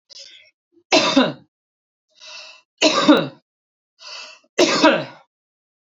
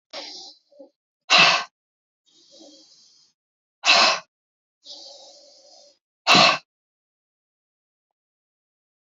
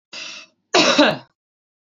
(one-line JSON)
{"three_cough_length": "6.0 s", "three_cough_amplitude": 27894, "three_cough_signal_mean_std_ratio": 0.38, "exhalation_length": "9.0 s", "exhalation_amplitude": 28008, "exhalation_signal_mean_std_ratio": 0.27, "cough_length": "1.9 s", "cough_amplitude": 27481, "cough_signal_mean_std_ratio": 0.41, "survey_phase": "beta (2021-08-13 to 2022-03-07)", "age": "45-64", "gender": "Female", "wearing_mask": "No", "symptom_none": true, "smoker_status": "Never smoked", "respiratory_condition_asthma": false, "respiratory_condition_other": false, "recruitment_source": "REACT", "submission_delay": "4 days", "covid_test_result": "Negative", "covid_test_method": "RT-qPCR", "influenza_a_test_result": "Negative", "influenza_b_test_result": "Negative"}